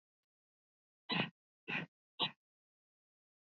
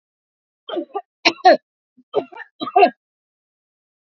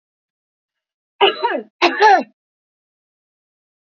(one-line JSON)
{"exhalation_length": "3.4 s", "exhalation_amplitude": 2542, "exhalation_signal_mean_std_ratio": 0.27, "three_cough_length": "4.1 s", "three_cough_amplitude": 29175, "three_cough_signal_mean_std_ratio": 0.28, "cough_length": "3.8 s", "cough_amplitude": 32768, "cough_signal_mean_std_ratio": 0.32, "survey_phase": "beta (2021-08-13 to 2022-03-07)", "age": "45-64", "gender": "Female", "wearing_mask": "No", "symptom_none": true, "smoker_status": "Ex-smoker", "respiratory_condition_asthma": false, "respiratory_condition_other": false, "recruitment_source": "REACT", "submission_delay": "8 days", "covid_test_result": "Negative", "covid_test_method": "RT-qPCR"}